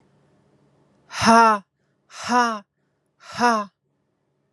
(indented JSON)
{
  "exhalation_length": "4.5 s",
  "exhalation_amplitude": 30151,
  "exhalation_signal_mean_std_ratio": 0.35,
  "survey_phase": "alpha (2021-03-01 to 2021-08-12)",
  "age": "18-44",
  "gender": "Female",
  "wearing_mask": "No",
  "symptom_cough_any": true,
  "symptom_shortness_of_breath": true,
  "symptom_fatigue": true,
  "symptom_change_to_sense_of_smell_or_taste": true,
  "symptom_loss_of_taste": true,
  "symptom_onset": "7 days",
  "smoker_status": "Never smoked",
  "respiratory_condition_asthma": false,
  "respiratory_condition_other": false,
  "recruitment_source": "Test and Trace",
  "submission_delay": "2 days",
  "covid_test_result": "Positive",
  "covid_test_method": "RT-qPCR",
  "covid_ct_value": 20.3,
  "covid_ct_gene": "ORF1ab gene",
  "covid_ct_mean": 21.2,
  "covid_viral_load": "110000 copies/ml",
  "covid_viral_load_category": "Low viral load (10K-1M copies/ml)"
}